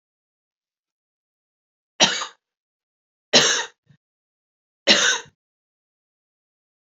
{"three_cough_length": "6.9 s", "three_cough_amplitude": 32768, "three_cough_signal_mean_std_ratio": 0.26, "survey_phase": "beta (2021-08-13 to 2022-03-07)", "age": "45-64", "gender": "Female", "wearing_mask": "No", "symptom_runny_or_blocked_nose": true, "symptom_onset": "6 days", "smoker_status": "Never smoked", "respiratory_condition_asthma": false, "respiratory_condition_other": false, "recruitment_source": "REACT", "submission_delay": "1 day", "covid_test_result": "Negative", "covid_test_method": "RT-qPCR", "influenza_a_test_result": "Negative", "influenza_b_test_result": "Negative"}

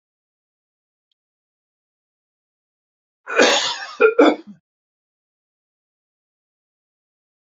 {"cough_length": "7.4 s", "cough_amplitude": 27132, "cough_signal_mean_std_ratio": 0.24, "survey_phase": "beta (2021-08-13 to 2022-03-07)", "age": "65+", "gender": "Male", "wearing_mask": "No", "symptom_cough_any": true, "symptom_runny_or_blocked_nose": true, "smoker_status": "Ex-smoker", "respiratory_condition_asthma": false, "respiratory_condition_other": false, "recruitment_source": "REACT", "submission_delay": "0 days", "covid_test_result": "Negative", "covid_test_method": "RT-qPCR"}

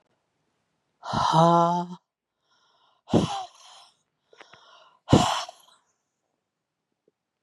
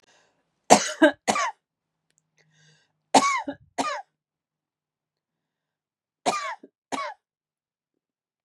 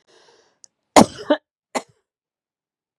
{"exhalation_length": "7.4 s", "exhalation_amplitude": 21566, "exhalation_signal_mean_std_ratio": 0.32, "three_cough_length": "8.4 s", "three_cough_amplitude": 32768, "three_cough_signal_mean_std_ratio": 0.26, "cough_length": "3.0 s", "cough_amplitude": 32768, "cough_signal_mean_std_ratio": 0.18, "survey_phase": "beta (2021-08-13 to 2022-03-07)", "age": "45-64", "gender": "Female", "wearing_mask": "No", "symptom_cough_any": true, "symptom_runny_or_blocked_nose": true, "symptom_shortness_of_breath": true, "symptom_sore_throat": true, "symptom_fatigue": true, "symptom_headache": true, "symptom_other": true, "smoker_status": "Never smoked", "respiratory_condition_asthma": false, "respiratory_condition_other": false, "recruitment_source": "Test and Trace", "submission_delay": "1 day", "covid_test_result": "Negative", "covid_test_method": "RT-qPCR"}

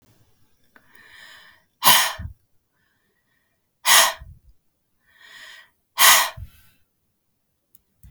{"exhalation_length": "8.1 s", "exhalation_amplitude": 32767, "exhalation_signal_mean_std_ratio": 0.27, "survey_phase": "beta (2021-08-13 to 2022-03-07)", "age": "18-44", "gender": "Female", "wearing_mask": "No", "symptom_none": true, "smoker_status": "Current smoker (1 to 10 cigarettes per day)", "respiratory_condition_asthma": false, "respiratory_condition_other": false, "recruitment_source": "REACT", "submission_delay": "3 days", "covid_test_result": "Negative", "covid_test_method": "RT-qPCR", "influenza_a_test_result": "Negative", "influenza_b_test_result": "Negative"}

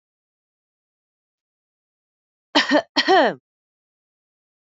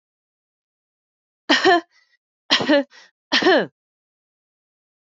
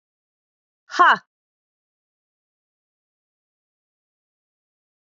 {"cough_length": "4.8 s", "cough_amplitude": 29225, "cough_signal_mean_std_ratio": 0.26, "three_cough_length": "5.0 s", "three_cough_amplitude": 25140, "three_cough_signal_mean_std_ratio": 0.34, "exhalation_length": "5.1 s", "exhalation_amplitude": 26326, "exhalation_signal_mean_std_ratio": 0.15, "survey_phase": "alpha (2021-03-01 to 2021-08-12)", "age": "18-44", "gender": "Female", "wearing_mask": "No", "symptom_fever_high_temperature": true, "symptom_onset": "5 days", "smoker_status": "Ex-smoker", "respiratory_condition_asthma": false, "respiratory_condition_other": false, "recruitment_source": "Test and Trace", "submission_delay": "2 days", "covid_test_result": "Positive", "covid_test_method": "RT-qPCR", "covid_ct_value": 15.9, "covid_ct_gene": "N gene", "covid_ct_mean": 17.1, "covid_viral_load": "2400000 copies/ml", "covid_viral_load_category": "High viral load (>1M copies/ml)"}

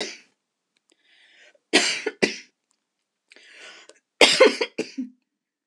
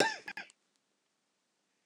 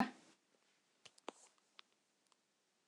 {"three_cough_length": "5.7 s", "three_cough_amplitude": 26028, "three_cough_signal_mean_std_ratio": 0.29, "cough_length": "1.9 s", "cough_amplitude": 7821, "cough_signal_mean_std_ratio": 0.25, "exhalation_length": "2.9 s", "exhalation_amplitude": 2667, "exhalation_signal_mean_std_ratio": 0.17, "survey_phase": "alpha (2021-03-01 to 2021-08-12)", "age": "45-64", "gender": "Female", "wearing_mask": "No", "symptom_none": true, "smoker_status": "Never smoked", "respiratory_condition_asthma": false, "respiratory_condition_other": false, "recruitment_source": "REACT", "submission_delay": "5 days", "covid_test_result": "Negative", "covid_test_method": "RT-qPCR"}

